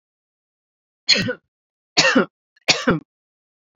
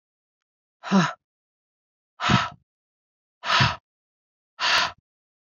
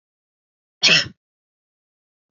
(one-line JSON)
{"three_cough_length": "3.8 s", "three_cough_amplitude": 31971, "three_cough_signal_mean_std_ratio": 0.34, "exhalation_length": "5.5 s", "exhalation_amplitude": 17346, "exhalation_signal_mean_std_ratio": 0.35, "cough_length": "2.3 s", "cough_amplitude": 32487, "cough_signal_mean_std_ratio": 0.24, "survey_phase": "beta (2021-08-13 to 2022-03-07)", "age": "45-64", "gender": "Female", "wearing_mask": "No", "symptom_none": true, "smoker_status": "Never smoked", "respiratory_condition_asthma": false, "respiratory_condition_other": false, "recruitment_source": "REACT", "submission_delay": "0 days", "covid_test_result": "Negative", "covid_test_method": "RT-qPCR", "influenza_a_test_result": "Negative", "influenza_b_test_result": "Negative"}